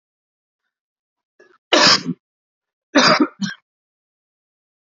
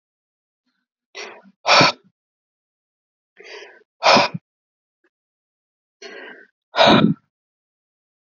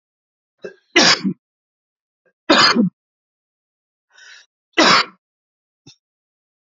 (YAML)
cough_length: 4.9 s
cough_amplitude: 32768
cough_signal_mean_std_ratio: 0.3
exhalation_length: 8.4 s
exhalation_amplitude: 29429
exhalation_signal_mean_std_ratio: 0.27
three_cough_length: 6.7 s
three_cough_amplitude: 32767
three_cough_signal_mean_std_ratio: 0.31
survey_phase: beta (2021-08-13 to 2022-03-07)
age: 45-64
gender: Male
wearing_mask: 'No'
symptom_fatigue: true
symptom_change_to_sense_of_smell_or_taste: true
smoker_status: Ex-smoker
respiratory_condition_asthma: false
respiratory_condition_other: false
recruitment_source: Test and Trace
submission_delay: 2 days
covid_test_result: Positive
covid_test_method: RT-qPCR
covid_ct_value: 26.4
covid_ct_gene: ORF1ab gene